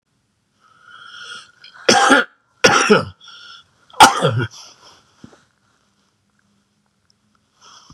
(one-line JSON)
{"three_cough_length": "7.9 s", "three_cough_amplitude": 32768, "three_cough_signal_mean_std_ratio": 0.31, "survey_phase": "beta (2021-08-13 to 2022-03-07)", "age": "45-64", "gender": "Male", "wearing_mask": "No", "symptom_none": true, "symptom_onset": "3 days", "smoker_status": "Never smoked", "respiratory_condition_asthma": false, "respiratory_condition_other": false, "recruitment_source": "REACT", "submission_delay": "1 day", "covid_test_result": "Negative", "covid_test_method": "RT-qPCR", "influenza_a_test_result": "Negative", "influenza_b_test_result": "Negative"}